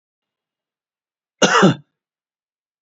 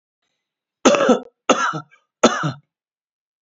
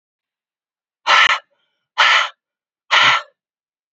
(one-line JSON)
{"cough_length": "2.8 s", "cough_amplitude": 30487, "cough_signal_mean_std_ratio": 0.27, "three_cough_length": "3.4 s", "three_cough_amplitude": 32767, "three_cough_signal_mean_std_ratio": 0.37, "exhalation_length": "3.9 s", "exhalation_amplitude": 32768, "exhalation_signal_mean_std_ratio": 0.39, "survey_phase": "beta (2021-08-13 to 2022-03-07)", "age": "45-64", "gender": "Male", "wearing_mask": "No", "symptom_none": true, "smoker_status": "Never smoked", "respiratory_condition_asthma": false, "respiratory_condition_other": false, "recruitment_source": "REACT", "submission_delay": "0 days", "covid_test_result": "Negative", "covid_test_method": "RT-qPCR", "influenza_a_test_result": "Negative", "influenza_b_test_result": "Negative"}